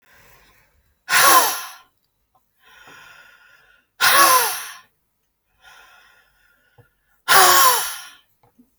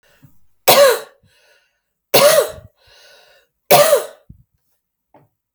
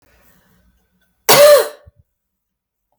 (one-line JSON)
{"exhalation_length": "8.8 s", "exhalation_amplitude": 32768, "exhalation_signal_mean_std_ratio": 0.36, "three_cough_length": "5.5 s", "three_cough_amplitude": 32768, "three_cough_signal_mean_std_ratio": 0.35, "cough_length": "3.0 s", "cough_amplitude": 32768, "cough_signal_mean_std_ratio": 0.31, "survey_phase": "alpha (2021-03-01 to 2021-08-12)", "age": "18-44", "gender": "Female", "wearing_mask": "No", "symptom_none": true, "smoker_status": "Ex-smoker", "respiratory_condition_asthma": false, "respiratory_condition_other": false, "recruitment_source": "REACT", "submission_delay": "2 days", "covid_test_result": "Negative", "covid_test_method": "RT-qPCR"}